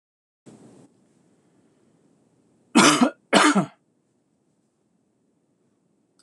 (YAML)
cough_length: 6.2 s
cough_amplitude: 25973
cough_signal_mean_std_ratio: 0.26
survey_phase: alpha (2021-03-01 to 2021-08-12)
age: 45-64
gender: Male
wearing_mask: 'No'
symptom_none: true
smoker_status: Never smoked
respiratory_condition_asthma: false
respiratory_condition_other: false
recruitment_source: REACT
submission_delay: 1 day
covid_test_result: Negative
covid_test_method: RT-qPCR